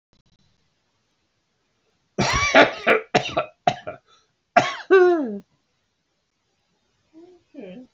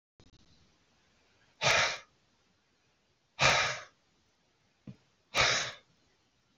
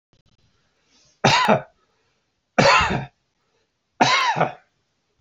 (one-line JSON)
{"cough_length": "7.9 s", "cough_amplitude": 29930, "cough_signal_mean_std_ratio": 0.34, "exhalation_length": "6.6 s", "exhalation_amplitude": 10517, "exhalation_signal_mean_std_ratio": 0.33, "three_cough_length": "5.2 s", "three_cough_amplitude": 27717, "three_cough_signal_mean_std_ratio": 0.4, "survey_phase": "beta (2021-08-13 to 2022-03-07)", "age": "45-64", "gender": "Male", "wearing_mask": "No", "symptom_none": true, "smoker_status": "Ex-smoker", "respiratory_condition_asthma": false, "respiratory_condition_other": false, "recruitment_source": "REACT", "submission_delay": "1 day", "covid_test_result": "Negative", "covid_test_method": "RT-qPCR"}